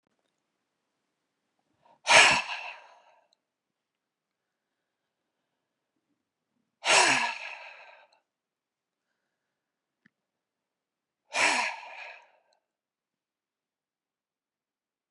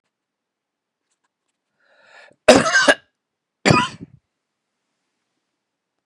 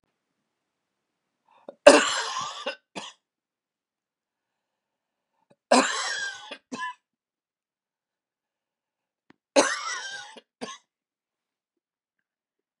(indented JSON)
{
  "exhalation_length": "15.1 s",
  "exhalation_amplitude": 23703,
  "exhalation_signal_mean_std_ratio": 0.23,
  "cough_length": "6.1 s",
  "cough_amplitude": 32768,
  "cough_signal_mean_std_ratio": 0.24,
  "three_cough_length": "12.8 s",
  "three_cough_amplitude": 32768,
  "three_cough_signal_mean_std_ratio": 0.22,
  "survey_phase": "beta (2021-08-13 to 2022-03-07)",
  "age": "65+",
  "gender": "Male",
  "wearing_mask": "No",
  "symptom_none": true,
  "smoker_status": "Never smoked",
  "respiratory_condition_asthma": false,
  "respiratory_condition_other": false,
  "recruitment_source": "REACT",
  "submission_delay": "4 days",
  "covid_test_result": "Negative",
  "covid_test_method": "RT-qPCR"
}